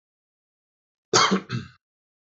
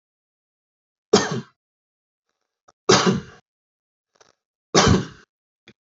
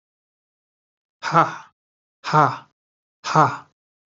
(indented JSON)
{
  "cough_length": "2.2 s",
  "cough_amplitude": 26030,
  "cough_signal_mean_std_ratio": 0.31,
  "three_cough_length": "6.0 s",
  "three_cough_amplitude": 31574,
  "three_cough_signal_mean_std_ratio": 0.28,
  "exhalation_length": "4.1 s",
  "exhalation_amplitude": 29669,
  "exhalation_signal_mean_std_ratio": 0.31,
  "survey_phase": "alpha (2021-03-01 to 2021-08-12)",
  "age": "45-64",
  "gender": "Male",
  "wearing_mask": "No",
  "symptom_none": true,
  "smoker_status": "Never smoked",
  "respiratory_condition_asthma": true,
  "respiratory_condition_other": false,
  "recruitment_source": "REACT",
  "submission_delay": "1 day",
  "covid_test_result": "Negative",
  "covid_test_method": "RT-qPCR"
}